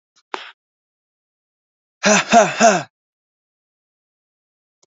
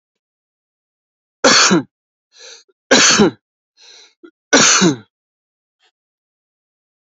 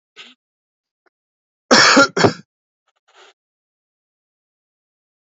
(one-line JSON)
{"exhalation_length": "4.9 s", "exhalation_amplitude": 28996, "exhalation_signal_mean_std_ratio": 0.29, "three_cough_length": "7.2 s", "three_cough_amplitude": 32768, "three_cough_signal_mean_std_ratio": 0.35, "cough_length": "5.2 s", "cough_amplitude": 31196, "cough_signal_mean_std_ratio": 0.25, "survey_phase": "beta (2021-08-13 to 2022-03-07)", "age": "18-44", "gender": "Male", "wearing_mask": "No", "symptom_none": true, "smoker_status": "Never smoked", "respiratory_condition_asthma": false, "respiratory_condition_other": false, "recruitment_source": "REACT", "submission_delay": "2 days", "covid_test_result": "Negative", "covid_test_method": "RT-qPCR", "influenza_a_test_result": "Negative", "influenza_b_test_result": "Negative"}